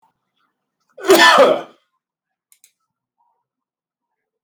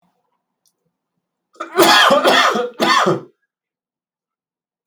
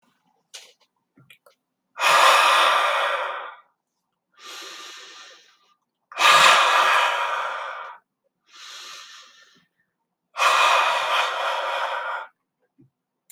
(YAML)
cough_length: 4.4 s
cough_amplitude: 32768
cough_signal_mean_std_ratio: 0.28
three_cough_length: 4.9 s
three_cough_amplitude: 32768
three_cough_signal_mean_std_ratio: 0.43
exhalation_length: 13.3 s
exhalation_amplitude: 31288
exhalation_signal_mean_std_ratio: 0.49
survey_phase: beta (2021-08-13 to 2022-03-07)
age: 18-44
gender: Male
wearing_mask: 'No'
symptom_cough_any: true
symptom_sore_throat: true
symptom_fatigue: true
symptom_change_to_sense_of_smell_or_taste: true
symptom_onset: 6 days
smoker_status: Never smoked
respiratory_condition_asthma: false
respiratory_condition_other: false
recruitment_source: Test and Trace
submission_delay: 3 days
covid_test_result: Positive
covid_test_method: ePCR